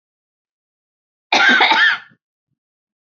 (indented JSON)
{
  "cough_length": "3.1 s",
  "cough_amplitude": 32767,
  "cough_signal_mean_std_ratio": 0.39,
  "survey_phase": "beta (2021-08-13 to 2022-03-07)",
  "age": "18-44",
  "gender": "Female",
  "wearing_mask": "No",
  "symptom_none": true,
  "symptom_onset": "11 days",
  "smoker_status": "Ex-smoker",
  "respiratory_condition_asthma": true,
  "respiratory_condition_other": false,
  "recruitment_source": "REACT",
  "submission_delay": "8 days",
  "covid_test_result": "Negative",
  "covid_test_method": "RT-qPCR",
  "influenza_a_test_result": "Negative",
  "influenza_b_test_result": "Negative"
}